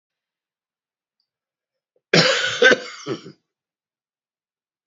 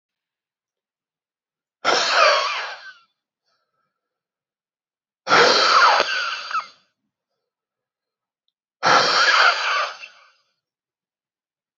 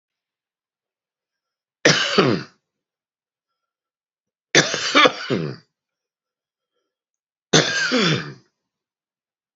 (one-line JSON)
{"cough_length": "4.9 s", "cough_amplitude": 28027, "cough_signal_mean_std_ratio": 0.28, "exhalation_length": "11.8 s", "exhalation_amplitude": 29295, "exhalation_signal_mean_std_ratio": 0.41, "three_cough_length": "9.6 s", "three_cough_amplitude": 32768, "three_cough_signal_mean_std_ratio": 0.33, "survey_phase": "beta (2021-08-13 to 2022-03-07)", "age": "45-64", "gender": "Male", "wearing_mask": "No", "symptom_cough_any": true, "symptom_shortness_of_breath": true, "smoker_status": "Current smoker (e-cigarettes or vapes only)", "respiratory_condition_asthma": false, "respiratory_condition_other": false, "recruitment_source": "Test and Trace", "submission_delay": "2 days", "covid_test_result": "Positive", "covid_test_method": "LFT"}